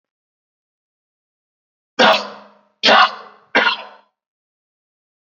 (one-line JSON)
{"three_cough_length": "5.3 s", "three_cough_amplitude": 30685, "three_cough_signal_mean_std_ratio": 0.3, "survey_phase": "beta (2021-08-13 to 2022-03-07)", "age": "18-44", "gender": "Male", "wearing_mask": "No", "symptom_runny_or_blocked_nose": true, "symptom_sore_throat": true, "symptom_fatigue": true, "symptom_headache": true, "smoker_status": "Never smoked", "respiratory_condition_asthma": false, "respiratory_condition_other": false, "recruitment_source": "Test and Trace", "submission_delay": "2 days", "covid_test_result": "Positive", "covid_test_method": "LFT"}